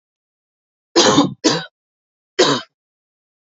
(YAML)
three_cough_length: 3.6 s
three_cough_amplitude: 32632
three_cough_signal_mean_std_ratio: 0.36
survey_phase: beta (2021-08-13 to 2022-03-07)
age: 18-44
gender: Male
wearing_mask: 'No'
symptom_cough_any: true
symptom_sore_throat: true
symptom_onset: 6 days
smoker_status: Never smoked
respiratory_condition_asthma: false
respiratory_condition_other: false
recruitment_source: REACT
submission_delay: 1 day
covid_test_result: Positive
covid_test_method: RT-qPCR
covid_ct_value: 21.8
covid_ct_gene: E gene
influenza_a_test_result: Negative
influenza_b_test_result: Negative